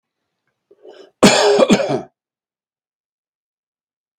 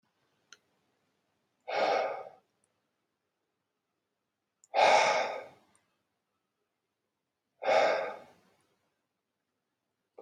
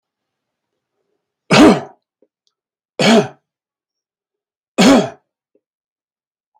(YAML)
cough_length: 4.2 s
cough_amplitude: 32768
cough_signal_mean_std_ratio: 0.33
exhalation_length: 10.2 s
exhalation_amplitude: 9706
exhalation_signal_mean_std_ratio: 0.31
three_cough_length: 6.6 s
three_cough_amplitude: 32768
three_cough_signal_mean_std_ratio: 0.29
survey_phase: beta (2021-08-13 to 2022-03-07)
age: 45-64
gender: Male
wearing_mask: 'No'
symptom_none: true
smoker_status: Ex-smoker
respiratory_condition_asthma: false
respiratory_condition_other: false
recruitment_source: REACT
submission_delay: 1 day
covid_test_result: Negative
covid_test_method: RT-qPCR
influenza_a_test_result: Negative
influenza_b_test_result: Negative